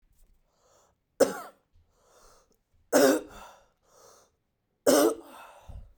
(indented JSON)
{
  "three_cough_length": "6.0 s",
  "three_cough_amplitude": 13895,
  "three_cough_signal_mean_std_ratio": 0.29,
  "survey_phase": "beta (2021-08-13 to 2022-03-07)",
  "age": "18-44",
  "gender": "Male",
  "wearing_mask": "No",
  "symptom_none": true,
  "smoker_status": "Never smoked",
  "respiratory_condition_asthma": false,
  "respiratory_condition_other": false,
  "recruitment_source": "REACT",
  "submission_delay": "1 day",
  "covid_test_result": "Negative",
  "covid_test_method": "RT-qPCR",
  "influenza_a_test_result": "Negative",
  "influenza_b_test_result": "Negative"
}